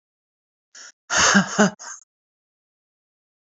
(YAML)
exhalation_length: 3.4 s
exhalation_amplitude: 26907
exhalation_signal_mean_std_ratio: 0.32
survey_phase: beta (2021-08-13 to 2022-03-07)
age: 45-64
gender: Female
wearing_mask: 'No'
symptom_runny_or_blocked_nose: true
symptom_sore_throat: true
symptom_headache: true
symptom_onset: 3 days
smoker_status: Current smoker (1 to 10 cigarettes per day)
respiratory_condition_asthma: false
respiratory_condition_other: false
recruitment_source: Test and Trace
submission_delay: 2 days
covid_test_result: Positive
covid_test_method: RT-qPCR
covid_ct_value: 27.8
covid_ct_gene: N gene